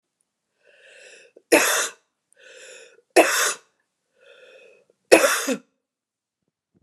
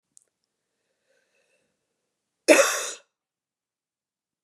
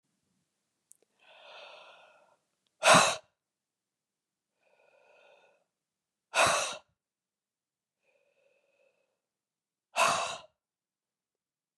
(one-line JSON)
{"three_cough_length": "6.8 s", "three_cough_amplitude": 32768, "three_cough_signal_mean_std_ratio": 0.3, "cough_length": "4.4 s", "cough_amplitude": 25711, "cough_signal_mean_std_ratio": 0.2, "exhalation_length": "11.8 s", "exhalation_amplitude": 13868, "exhalation_signal_mean_std_ratio": 0.22, "survey_phase": "beta (2021-08-13 to 2022-03-07)", "age": "45-64", "gender": "Female", "wearing_mask": "No", "symptom_cough_any": true, "symptom_new_continuous_cough": true, "symptom_fatigue": true, "symptom_headache": true, "symptom_onset": "3 days", "smoker_status": "Never smoked", "respiratory_condition_asthma": false, "respiratory_condition_other": false, "recruitment_source": "Test and Trace", "submission_delay": "1 day", "covid_test_result": "Positive", "covid_test_method": "RT-qPCR", "covid_ct_value": 28.6, "covid_ct_gene": "ORF1ab gene"}